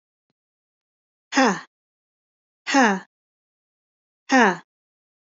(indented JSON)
{
  "exhalation_length": "5.2 s",
  "exhalation_amplitude": 20145,
  "exhalation_signal_mean_std_ratio": 0.3,
  "survey_phase": "beta (2021-08-13 to 2022-03-07)",
  "age": "18-44",
  "gender": "Female",
  "wearing_mask": "No",
  "symptom_cough_any": true,
  "symptom_runny_or_blocked_nose": true,
  "symptom_sore_throat": true,
  "symptom_fatigue": true,
  "symptom_onset": "2 days",
  "smoker_status": "Never smoked",
  "respiratory_condition_asthma": false,
  "respiratory_condition_other": false,
  "recruitment_source": "Test and Trace",
  "submission_delay": "1 day",
  "covid_test_result": "Positive",
  "covid_test_method": "RT-qPCR",
  "covid_ct_value": 24.3,
  "covid_ct_gene": "ORF1ab gene",
  "covid_ct_mean": 24.7,
  "covid_viral_load": "8100 copies/ml",
  "covid_viral_load_category": "Minimal viral load (< 10K copies/ml)"
}